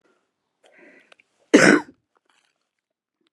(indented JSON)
{
  "cough_length": "3.3 s",
  "cough_amplitude": 32179,
  "cough_signal_mean_std_ratio": 0.22,
  "survey_phase": "alpha (2021-03-01 to 2021-08-12)",
  "age": "65+",
  "gender": "Female",
  "wearing_mask": "No",
  "symptom_none": true,
  "smoker_status": "Ex-smoker",
  "respiratory_condition_asthma": false,
  "respiratory_condition_other": false,
  "recruitment_source": "REACT",
  "submission_delay": "1 day",
  "covid_test_result": "Negative",
  "covid_test_method": "RT-qPCR"
}